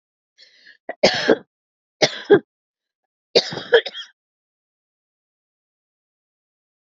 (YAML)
three_cough_length: 6.8 s
three_cough_amplitude: 32768
three_cough_signal_mean_std_ratio: 0.24
survey_phase: beta (2021-08-13 to 2022-03-07)
age: 45-64
gender: Female
wearing_mask: 'No'
symptom_cough_any: true
smoker_status: Never smoked
respiratory_condition_asthma: false
respiratory_condition_other: false
recruitment_source: Test and Trace
submission_delay: 1 day
covid_test_result: Negative
covid_test_method: LFT